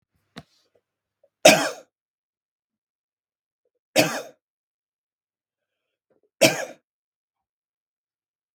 three_cough_length: 8.5 s
three_cough_amplitude: 32768
three_cough_signal_mean_std_ratio: 0.18
survey_phase: beta (2021-08-13 to 2022-03-07)
age: 45-64
gender: Male
wearing_mask: 'No'
symptom_none: true
smoker_status: Ex-smoker
respiratory_condition_asthma: false
respiratory_condition_other: false
recruitment_source: REACT
submission_delay: 0 days
covid_test_result: Negative
covid_test_method: RT-qPCR
influenza_a_test_result: Negative
influenza_b_test_result: Negative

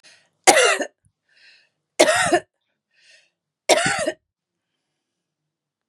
three_cough_length: 5.9 s
three_cough_amplitude: 32768
three_cough_signal_mean_std_ratio: 0.33
survey_phase: beta (2021-08-13 to 2022-03-07)
age: 65+
gender: Female
wearing_mask: 'No'
symptom_none: true
smoker_status: Ex-smoker
respiratory_condition_asthma: false
respiratory_condition_other: false
recruitment_source: REACT
submission_delay: 2 days
covid_test_result: Negative
covid_test_method: RT-qPCR
influenza_a_test_result: Negative
influenza_b_test_result: Negative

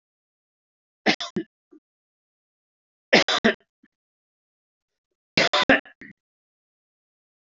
three_cough_length: 7.6 s
three_cough_amplitude: 24147
three_cough_signal_mean_std_ratio: 0.24
survey_phase: alpha (2021-03-01 to 2021-08-12)
age: 45-64
gender: Male
wearing_mask: 'No'
symptom_cough_any: true
symptom_change_to_sense_of_smell_or_taste: true
symptom_loss_of_taste: true
smoker_status: Never smoked
respiratory_condition_asthma: false
respiratory_condition_other: false
recruitment_source: Test and Trace
submission_delay: 2 days
covid_test_result: Positive
covid_test_method: RT-qPCR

